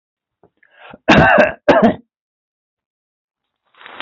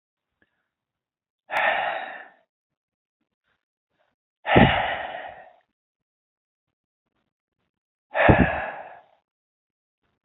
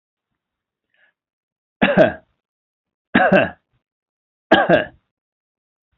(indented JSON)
{
  "cough_length": "4.0 s",
  "cough_amplitude": 30989,
  "cough_signal_mean_std_ratio": 0.35,
  "exhalation_length": "10.2 s",
  "exhalation_amplitude": 27352,
  "exhalation_signal_mean_std_ratio": 0.29,
  "three_cough_length": "6.0 s",
  "three_cough_amplitude": 29674,
  "three_cough_signal_mean_std_ratio": 0.3,
  "survey_phase": "beta (2021-08-13 to 2022-03-07)",
  "age": "45-64",
  "gender": "Male",
  "wearing_mask": "No",
  "symptom_none": true,
  "smoker_status": "Never smoked",
  "respiratory_condition_asthma": false,
  "respiratory_condition_other": false,
  "recruitment_source": "REACT",
  "submission_delay": "1 day",
  "covid_test_result": "Negative",
  "covid_test_method": "RT-qPCR",
  "influenza_a_test_result": "Negative",
  "influenza_b_test_result": "Negative"
}